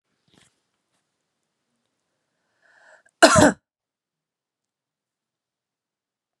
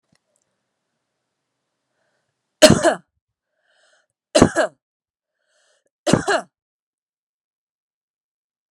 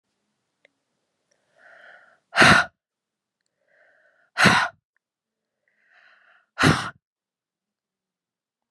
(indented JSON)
{
  "cough_length": "6.4 s",
  "cough_amplitude": 32658,
  "cough_signal_mean_std_ratio": 0.16,
  "three_cough_length": "8.7 s",
  "three_cough_amplitude": 32768,
  "three_cough_signal_mean_std_ratio": 0.21,
  "exhalation_length": "8.7 s",
  "exhalation_amplitude": 30350,
  "exhalation_signal_mean_std_ratio": 0.24,
  "survey_phase": "beta (2021-08-13 to 2022-03-07)",
  "age": "18-44",
  "gender": "Female",
  "wearing_mask": "No",
  "symptom_runny_or_blocked_nose": true,
  "symptom_fatigue": true,
  "smoker_status": "Current smoker (1 to 10 cigarettes per day)",
  "respiratory_condition_asthma": false,
  "respiratory_condition_other": false,
  "recruitment_source": "Test and Trace",
  "submission_delay": "2 days",
  "covid_test_result": "Positive",
  "covid_test_method": "RT-qPCR",
  "covid_ct_value": 19.5,
  "covid_ct_gene": "ORF1ab gene"
}